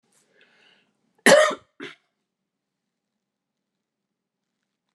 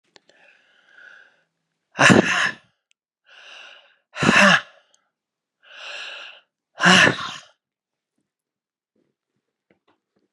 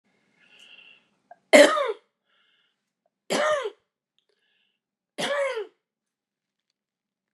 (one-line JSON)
{"cough_length": "4.9 s", "cough_amplitude": 28472, "cough_signal_mean_std_ratio": 0.19, "exhalation_length": "10.3 s", "exhalation_amplitude": 31958, "exhalation_signal_mean_std_ratio": 0.29, "three_cough_length": "7.3 s", "three_cough_amplitude": 32530, "three_cough_signal_mean_std_ratio": 0.26, "survey_phase": "beta (2021-08-13 to 2022-03-07)", "age": "65+", "gender": "Female", "wearing_mask": "No", "symptom_cough_any": true, "symptom_runny_or_blocked_nose": true, "symptom_shortness_of_breath": true, "symptom_fatigue": true, "symptom_headache": true, "symptom_other": true, "symptom_onset": "4 days", "smoker_status": "Ex-smoker", "respiratory_condition_asthma": false, "respiratory_condition_other": false, "recruitment_source": "Test and Trace", "submission_delay": "1 day", "covid_test_result": "Positive", "covid_test_method": "RT-qPCR", "covid_ct_value": 13.3, "covid_ct_gene": "ORF1ab gene", "covid_ct_mean": 13.9, "covid_viral_load": "28000000 copies/ml", "covid_viral_load_category": "High viral load (>1M copies/ml)"}